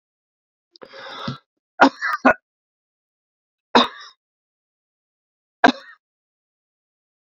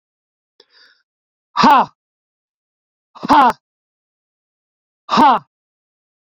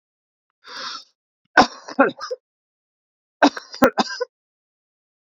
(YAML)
three_cough_length: 7.3 s
three_cough_amplitude: 28872
three_cough_signal_mean_std_ratio: 0.21
exhalation_length: 6.3 s
exhalation_amplitude: 29985
exhalation_signal_mean_std_ratio: 0.3
cough_length: 5.4 s
cough_amplitude: 32629
cough_signal_mean_std_ratio: 0.26
survey_phase: beta (2021-08-13 to 2022-03-07)
age: 65+
gender: Male
wearing_mask: 'No'
symptom_cough_any: true
symptom_runny_or_blocked_nose: true
symptom_fatigue: true
smoker_status: Ex-smoker
respiratory_condition_asthma: true
respiratory_condition_other: false
recruitment_source: Test and Trace
submission_delay: 2 days
covid_test_result: Positive
covid_test_method: RT-qPCR
covid_ct_value: 22.6
covid_ct_gene: ORF1ab gene